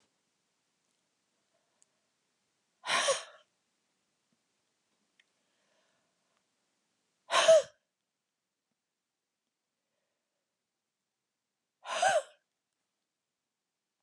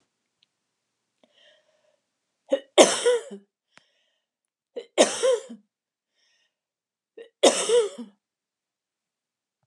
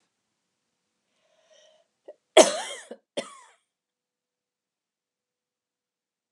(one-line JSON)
{"exhalation_length": "14.0 s", "exhalation_amplitude": 7912, "exhalation_signal_mean_std_ratio": 0.19, "three_cough_length": "9.7 s", "three_cough_amplitude": 31167, "three_cough_signal_mean_std_ratio": 0.27, "cough_length": "6.3 s", "cough_amplitude": 30112, "cough_signal_mean_std_ratio": 0.14, "survey_phase": "beta (2021-08-13 to 2022-03-07)", "age": "45-64", "gender": "Female", "wearing_mask": "No", "symptom_runny_or_blocked_nose": true, "symptom_headache": true, "smoker_status": "Never smoked", "respiratory_condition_asthma": false, "respiratory_condition_other": false, "recruitment_source": "REACT", "submission_delay": "1 day", "covid_test_result": "Negative", "covid_test_method": "RT-qPCR", "influenza_a_test_result": "Negative", "influenza_b_test_result": "Negative"}